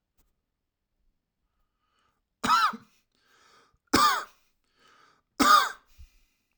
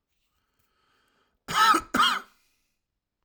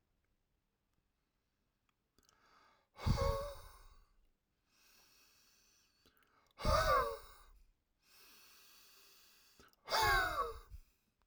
{"three_cough_length": "6.6 s", "three_cough_amplitude": 16692, "three_cough_signal_mean_std_ratio": 0.29, "cough_length": "3.2 s", "cough_amplitude": 11971, "cough_signal_mean_std_ratio": 0.33, "exhalation_length": "11.3 s", "exhalation_amplitude": 3258, "exhalation_signal_mean_std_ratio": 0.33, "survey_phase": "alpha (2021-03-01 to 2021-08-12)", "age": "18-44", "gender": "Male", "wearing_mask": "No", "symptom_cough_any": true, "symptom_onset": "12 days", "smoker_status": "Never smoked", "respiratory_condition_asthma": false, "respiratory_condition_other": false, "recruitment_source": "REACT", "submission_delay": "1 day", "covid_test_result": "Negative", "covid_test_method": "RT-qPCR"}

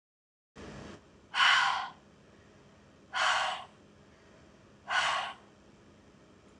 {"exhalation_length": "6.6 s", "exhalation_amplitude": 7975, "exhalation_signal_mean_std_ratio": 0.41, "survey_phase": "alpha (2021-03-01 to 2021-08-12)", "age": "45-64", "gender": "Female", "wearing_mask": "No", "symptom_none": true, "smoker_status": "Ex-smoker", "respiratory_condition_asthma": false, "respiratory_condition_other": false, "recruitment_source": "REACT", "submission_delay": "1 day", "covid_test_result": "Negative", "covid_test_method": "RT-qPCR"}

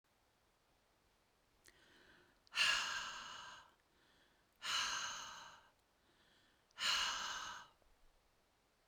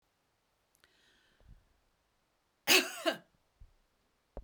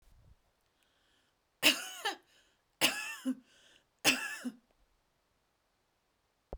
{"exhalation_length": "8.9 s", "exhalation_amplitude": 2594, "exhalation_signal_mean_std_ratio": 0.42, "cough_length": "4.4 s", "cough_amplitude": 9297, "cough_signal_mean_std_ratio": 0.21, "three_cough_length": "6.6 s", "three_cough_amplitude": 9792, "three_cough_signal_mean_std_ratio": 0.29, "survey_phase": "beta (2021-08-13 to 2022-03-07)", "age": "65+", "gender": "Female", "wearing_mask": "No", "symptom_none": true, "smoker_status": "Never smoked", "respiratory_condition_asthma": false, "respiratory_condition_other": false, "recruitment_source": "REACT", "submission_delay": "3 days", "covid_test_result": "Negative", "covid_test_method": "RT-qPCR"}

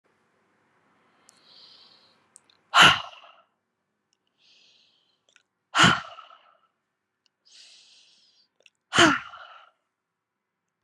{"exhalation_length": "10.8 s", "exhalation_amplitude": 27239, "exhalation_signal_mean_std_ratio": 0.21, "survey_phase": "beta (2021-08-13 to 2022-03-07)", "age": "18-44", "gender": "Female", "wearing_mask": "No", "symptom_runny_or_blocked_nose": true, "symptom_onset": "3 days", "smoker_status": "Ex-smoker", "respiratory_condition_asthma": false, "respiratory_condition_other": false, "recruitment_source": "REACT", "submission_delay": "3 days", "covid_test_result": "Negative", "covid_test_method": "RT-qPCR", "influenza_a_test_result": "Unknown/Void", "influenza_b_test_result": "Unknown/Void"}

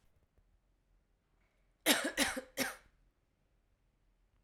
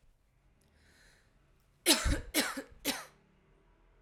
{"cough_length": "4.4 s", "cough_amplitude": 6815, "cough_signal_mean_std_ratio": 0.28, "three_cough_length": "4.0 s", "three_cough_amplitude": 10694, "three_cough_signal_mean_std_ratio": 0.33, "survey_phase": "alpha (2021-03-01 to 2021-08-12)", "age": "18-44", "gender": "Female", "wearing_mask": "No", "symptom_cough_any": true, "symptom_fatigue": true, "smoker_status": "Current smoker (1 to 10 cigarettes per day)", "respiratory_condition_asthma": false, "respiratory_condition_other": false, "recruitment_source": "REACT", "submission_delay": "1 day", "covid_test_result": "Negative", "covid_test_method": "RT-qPCR"}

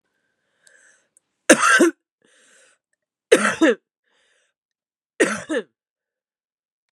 {"three_cough_length": "6.9 s", "three_cough_amplitude": 32768, "three_cough_signal_mean_std_ratio": 0.29, "survey_phase": "beta (2021-08-13 to 2022-03-07)", "age": "18-44", "gender": "Female", "wearing_mask": "No", "symptom_cough_any": true, "symptom_runny_or_blocked_nose": true, "symptom_shortness_of_breath": true, "symptom_sore_throat": true, "symptom_fatigue": true, "symptom_headache": true, "symptom_onset": "3 days", "smoker_status": "Current smoker (11 or more cigarettes per day)", "respiratory_condition_asthma": false, "respiratory_condition_other": false, "recruitment_source": "Test and Trace", "submission_delay": "1 day", "covid_test_result": "Positive", "covid_test_method": "RT-qPCR", "covid_ct_value": 22.3, "covid_ct_gene": "ORF1ab gene"}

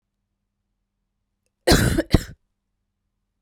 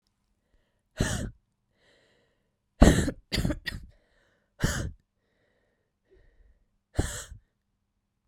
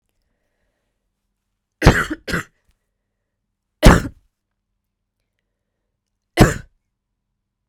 {"cough_length": "3.4 s", "cough_amplitude": 32768, "cough_signal_mean_std_ratio": 0.26, "exhalation_length": "8.3 s", "exhalation_amplitude": 28711, "exhalation_signal_mean_std_ratio": 0.25, "three_cough_length": "7.7 s", "three_cough_amplitude": 32768, "three_cough_signal_mean_std_ratio": 0.21, "survey_phase": "beta (2021-08-13 to 2022-03-07)", "age": "18-44", "gender": "Female", "wearing_mask": "No", "symptom_runny_or_blocked_nose": true, "symptom_sore_throat": true, "symptom_diarrhoea": true, "symptom_fatigue": true, "symptom_fever_high_temperature": true, "symptom_headache": true, "symptom_change_to_sense_of_smell_or_taste": true, "smoker_status": "Never smoked", "respiratory_condition_asthma": true, "respiratory_condition_other": false, "recruitment_source": "Test and Trace", "submission_delay": "3 days", "covid_test_result": "Positive", "covid_test_method": "LFT"}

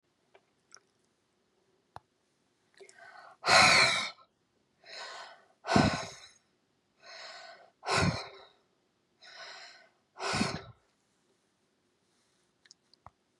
{"exhalation_length": "13.4 s", "exhalation_amplitude": 11873, "exhalation_signal_mean_std_ratio": 0.29, "survey_phase": "beta (2021-08-13 to 2022-03-07)", "age": "65+", "gender": "Female", "wearing_mask": "No", "symptom_none": true, "smoker_status": "Never smoked", "respiratory_condition_asthma": false, "respiratory_condition_other": false, "recruitment_source": "REACT", "submission_delay": "1 day", "covid_test_result": "Negative", "covid_test_method": "RT-qPCR", "influenza_a_test_result": "Negative", "influenza_b_test_result": "Negative"}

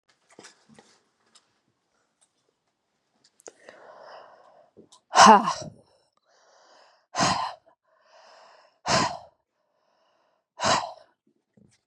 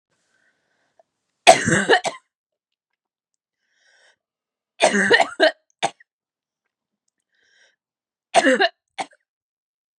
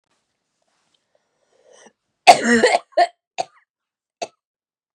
{"exhalation_length": "11.9 s", "exhalation_amplitude": 32415, "exhalation_signal_mean_std_ratio": 0.22, "three_cough_length": "10.0 s", "three_cough_amplitude": 32768, "three_cough_signal_mean_std_ratio": 0.28, "cough_length": "4.9 s", "cough_amplitude": 32768, "cough_signal_mean_std_ratio": 0.25, "survey_phase": "beta (2021-08-13 to 2022-03-07)", "age": "45-64", "gender": "Female", "wearing_mask": "No", "symptom_cough_any": true, "symptom_sore_throat": true, "symptom_abdominal_pain": true, "symptom_fatigue": true, "symptom_fever_high_temperature": true, "symptom_headache": true, "symptom_change_to_sense_of_smell_or_taste": true, "symptom_loss_of_taste": true, "symptom_other": true, "smoker_status": "Never smoked", "respiratory_condition_asthma": false, "respiratory_condition_other": false, "recruitment_source": "Test and Trace", "submission_delay": "2 days", "covid_test_result": "Positive", "covid_test_method": "RT-qPCR"}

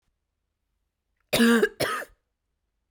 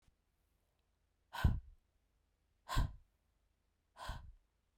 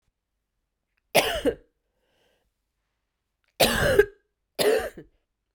{"cough_length": "2.9 s", "cough_amplitude": 12080, "cough_signal_mean_std_ratio": 0.34, "exhalation_length": "4.8 s", "exhalation_amplitude": 3461, "exhalation_signal_mean_std_ratio": 0.26, "three_cough_length": "5.5 s", "three_cough_amplitude": 20984, "three_cough_signal_mean_std_ratio": 0.34, "survey_phase": "beta (2021-08-13 to 2022-03-07)", "age": "18-44", "gender": "Female", "wearing_mask": "No", "symptom_runny_or_blocked_nose": true, "symptom_fatigue": true, "symptom_headache": true, "smoker_status": "Never smoked", "respiratory_condition_asthma": false, "respiratory_condition_other": false, "recruitment_source": "Test and Trace", "submission_delay": "2 days", "covid_test_result": "Positive", "covid_test_method": "ePCR"}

